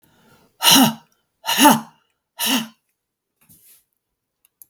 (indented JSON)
{
  "exhalation_length": "4.7 s",
  "exhalation_amplitude": 32768,
  "exhalation_signal_mean_std_ratio": 0.33,
  "survey_phase": "beta (2021-08-13 to 2022-03-07)",
  "age": "65+",
  "gender": "Female",
  "wearing_mask": "No",
  "symptom_none": true,
  "smoker_status": "Ex-smoker",
  "respiratory_condition_asthma": false,
  "respiratory_condition_other": true,
  "recruitment_source": "Test and Trace",
  "submission_delay": "-1 day",
  "covid_test_result": "Positive",
  "covid_test_method": "LFT"
}